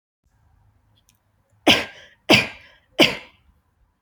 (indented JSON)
{
  "three_cough_length": "4.0 s",
  "three_cough_amplitude": 31194,
  "three_cough_signal_mean_std_ratio": 0.26,
  "survey_phase": "alpha (2021-03-01 to 2021-08-12)",
  "age": "18-44",
  "gender": "Female",
  "wearing_mask": "No",
  "symptom_fatigue": true,
  "symptom_headache": true,
  "smoker_status": "Never smoked",
  "respiratory_condition_asthma": false,
  "respiratory_condition_other": false,
  "recruitment_source": "REACT",
  "submission_delay": "1 day",
  "covid_test_result": "Negative",
  "covid_test_method": "RT-qPCR"
}